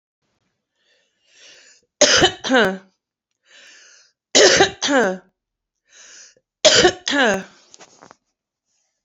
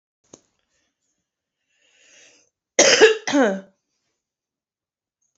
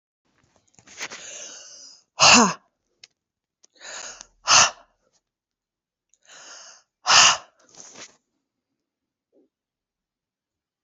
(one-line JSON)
{"three_cough_length": "9.0 s", "three_cough_amplitude": 32768, "three_cough_signal_mean_std_ratio": 0.36, "cough_length": "5.4 s", "cough_amplitude": 32060, "cough_signal_mean_std_ratio": 0.27, "exhalation_length": "10.8 s", "exhalation_amplitude": 30048, "exhalation_signal_mean_std_ratio": 0.24, "survey_phase": "beta (2021-08-13 to 2022-03-07)", "age": "45-64", "gender": "Female", "wearing_mask": "No", "symptom_cough_any": true, "symptom_runny_or_blocked_nose": true, "symptom_headache": true, "symptom_onset": "3 days", "smoker_status": "Current smoker (11 or more cigarettes per day)", "respiratory_condition_asthma": false, "respiratory_condition_other": false, "recruitment_source": "REACT", "submission_delay": "1 day", "covid_test_result": "Negative", "covid_test_method": "RT-qPCR", "influenza_a_test_result": "Negative", "influenza_b_test_result": "Negative"}